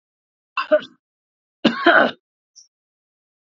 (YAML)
cough_length: 3.4 s
cough_amplitude: 32767
cough_signal_mean_std_ratio: 0.3
survey_phase: alpha (2021-03-01 to 2021-08-12)
age: 65+
gender: Male
wearing_mask: 'No'
symptom_fever_high_temperature: true
smoker_status: Never smoked
respiratory_condition_asthma: false
respiratory_condition_other: false
recruitment_source: Test and Trace
submission_delay: 2 days
covid_test_result: Positive
covid_test_method: RT-qPCR